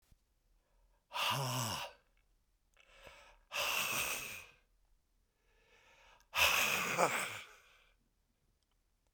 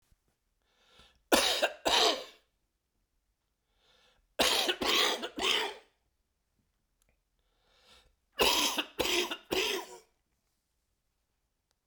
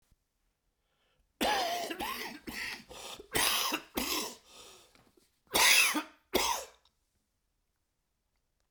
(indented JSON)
{
  "exhalation_length": "9.1 s",
  "exhalation_amplitude": 6695,
  "exhalation_signal_mean_std_ratio": 0.44,
  "three_cough_length": "11.9 s",
  "three_cough_amplitude": 11435,
  "three_cough_signal_mean_std_ratio": 0.4,
  "cough_length": "8.7 s",
  "cough_amplitude": 10527,
  "cough_signal_mean_std_ratio": 0.43,
  "survey_phase": "beta (2021-08-13 to 2022-03-07)",
  "age": "65+",
  "gender": "Male",
  "wearing_mask": "No",
  "symptom_cough_any": true,
  "symptom_runny_or_blocked_nose": true,
  "symptom_headache": true,
  "symptom_onset": "7 days",
  "smoker_status": "Never smoked",
  "respiratory_condition_asthma": true,
  "respiratory_condition_other": false,
  "recruitment_source": "Test and Trace",
  "submission_delay": "1 day",
  "covid_test_result": "Positive",
  "covid_test_method": "RT-qPCR",
  "covid_ct_value": 22.4,
  "covid_ct_gene": "ORF1ab gene",
  "covid_ct_mean": 23.2,
  "covid_viral_load": "24000 copies/ml",
  "covid_viral_load_category": "Low viral load (10K-1M copies/ml)"
}